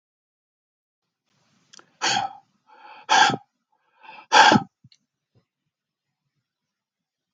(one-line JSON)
{"exhalation_length": "7.3 s", "exhalation_amplitude": 26806, "exhalation_signal_mean_std_ratio": 0.25, "survey_phase": "beta (2021-08-13 to 2022-03-07)", "age": "45-64", "gender": "Male", "wearing_mask": "No", "symptom_none": true, "smoker_status": "Never smoked", "respiratory_condition_asthma": false, "respiratory_condition_other": false, "recruitment_source": "Test and Trace", "submission_delay": "0 days", "covid_test_result": "Negative", "covid_test_method": "LFT"}